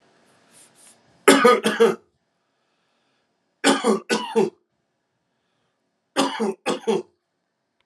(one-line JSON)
{"three_cough_length": "7.9 s", "three_cough_amplitude": 32172, "three_cough_signal_mean_std_ratio": 0.36, "survey_phase": "alpha (2021-03-01 to 2021-08-12)", "age": "45-64", "gender": "Male", "wearing_mask": "No", "symptom_abdominal_pain": true, "symptom_diarrhoea": true, "symptom_fever_high_temperature": true, "symptom_headache": true, "symptom_onset": "2 days", "smoker_status": "Current smoker (1 to 10 cigarettes per day)", "respiratory_condition_asthma": false, "respiratory_condition_other": false, "recruitment_source": "Test and Trace", "submission_delay": "1 day", "covid_test_result": "Positive", "covid_test_method": "LFT"}